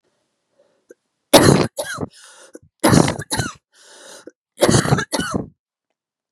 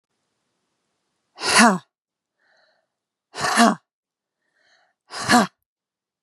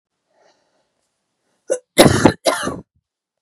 {"three_cough_length": "6.3 s", "three_cough_amplitude": 32768, "three_cough_signal_mean_std_ratio": 0.37, "exhalation_length": "6.2 s", "exhalation_amplitude": 30152, "exhalation_signal_mean_std_ratio": 0.29, "cough_length": "3.4 s", "cough_amplitude": 32768, "cough_signal_mean_std_ratio": 0.3, "survey_phase": "beta (2021-08-13 to 2022-03-07)", "age": "18-44", "gender": "Female", "wearing_mask": "No", "symptom_none": true, "smoker_status": "Never smoked", "respiratory_condition_asthma": true, "respiratory_condition_other": false, "recruitment_source": "REACT", "submission_delay": "2 days", "covid_test_result": "Negative", "covid_test_method": "RT-qPCR", "influenza_a_test_result": "Negative", "influenza_b_test_result": "Negative"}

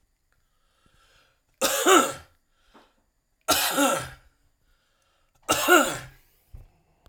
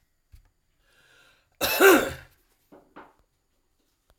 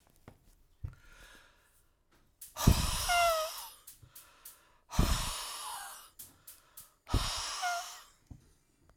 {"three_cough_length": "7.1 s", "three_cough_amplitude": 20109, "three_cough_signal_mean_std_ratio": 0.36, "cough_length": "4.2 s", "cough_amplitude": 21616, "cough_signal_mean_std_ratio": 0.25, "exhalation_length": "9.0 s", "exhalation_amplitude": 10879, "exhalation_signal_mean_std_ratio": 0.42, "survey_phase": "alpha (2021-03-01 to 2021-08-12)", "age": "65+", "gender": "Male", "wearing_mask": "No", "symptom_cough_any": true, "symptom_diarrhoea": true, "symptom_fatigue": true, "symptom_headache": true, "symptom_loss_of_taste": true, "symptom_onset": "5 days", "smoker_status": "Never smoked", "respiratory_condition_asthma": true, "respiratory_condition_other": false, "recruitment_source": "Test and Trace", "submission_delay": "2 days", "covid_test_result": "Positive", "covid_test_method": "RT-qPCR", "covid_ct_value": 20.5, "covid_ct_gene": "ORF1ab gene", "covid_ct_mean": 20.8, "covid_viral_load": "160000 copies/ml", "covid_viral_load_category": "Low viral load (10K-1M copies/ml)"}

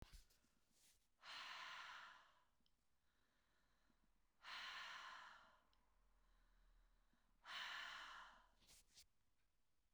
{"exhalation_length": "9.9 s", "exhalation_amplitude": 306, "exhalation_signal_mean_std_ratio": 0.56, "survey_phase": "beta (2021-08-13 to 2022-03-07)", "age": "45-64", "gender": "Female", "wearing_mask": "No", "symptom_cough_any": true, "symptom_onset": "12 days", "smoker_status": "Ex-smoker", "respiratory_condition_asthma": false, "respiratory_condition_other": false, "recruitment_source": "REACT", "submission_delay": "1 day", "covid_test_result": "Negative", "covid_test_method": "RT-qPCR"}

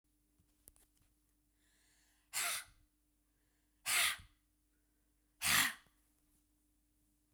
{"exhalation_length": "7.3 s", "exhalation_amplitude": 4058, "exhalation_signal_mean_std_ratio": 0.28, "survey_phase": "beta (2021-08-13 to 2022-03-07)", "age": "45-64", "gender": "Female", "wearing_mask": "No", "symptom_cough_any": true, "symptom_runny_or_blocked_nose": true, "symptom_headache": true, "smoker_status": "Never smoked", "respiratory_condition_asthma": false, "respiratory_condition_other": false, "recruitment_source": "Test and Trace", "submission_delay": "1 day", "covid_test_result": "Positive", "covid_test_method": "RT-qPCR", "covid_ct_value": 32.3, "covid_ct_gene": "ORF1ab gene", "covid_ct_mean": 34.6, "covid_viral_load": "4.5 copies/ml", "covid_viral_load_category": "Minimal viral load (< 10K copies/ml)"}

